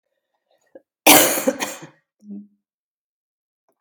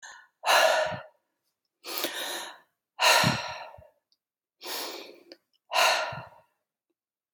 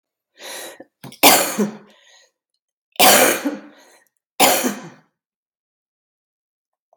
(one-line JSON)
{"cough_length": "3.8 s", "cough_amplitude": 32768, "cough_signal_mean_std_ratio": 0.27, "exhalation_length": "7.3 s", "exhalation_amplitude": 13381, "exhalation_signal_mean_std_ratio": 0.42, "three_cough_length": "7.0 s", "three_cough_amplitude": 32768, "three_cough_signal_mean_std_ratio": 0.34, "survey_phase": "beta (2021-08-13 to 2022-03-07)", "age": "45-64", "gender": "Female", "wearing_mask": "No", "symptom_cough_any": true, "symptom_runny_or_blocked_nose": true, "symptom_sore_throat": true, "symptom_fatigue": true, "symptom_headache": true, "smoker_status": "Never smoked", "respiratory_condition_asthma": false, "respiratory_condition_other": false, "recruitment_source": "Test and Trace", "submission_delay": "2 days", "covid_test_result": "Positive", "covid_test_method": "RT-qPCR", "covid_ct_value": 30.7, "covid_ct_gene": "ORF1ab gene", "covid_ct_mean": 32.0, "covid_viral_load": "32 copies/ml", "covid_viral_load_category": "Minimal viral load (< 10K copies/ml)"}